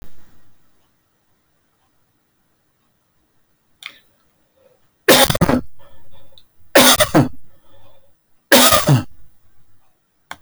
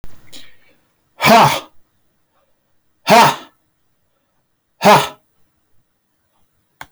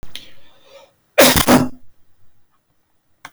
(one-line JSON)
{"three_cough_length": "10.4 s", "three_cough_amplitude": 32768, "three_cough_signal_mean_std_ratio": 0.36, "exhalation_length": "6.9 s", "exhalation_amplitude": 32768, "exhalation_signal_mean_std_ratio": 0.32, "cough_length": "3.3 s", "cough_amplitude": 32768, "cough_signal_mean_std_ratio": 0.36, "survey_phase": "alpha (2021-03-01 to 2021-08-12)", "age": "45-64", "gender": "Male", "wearing_mask": "No", "symptom_none": true, "smoker_status": "Never smoked", "respiratory_condition_asthma": false, "respiratory_condition_other": false, "recruitment_source": "REACT", "submission_delay": "4 days", "covid_test_result": "Negative", "covid_test_method": "RT-qPCR"}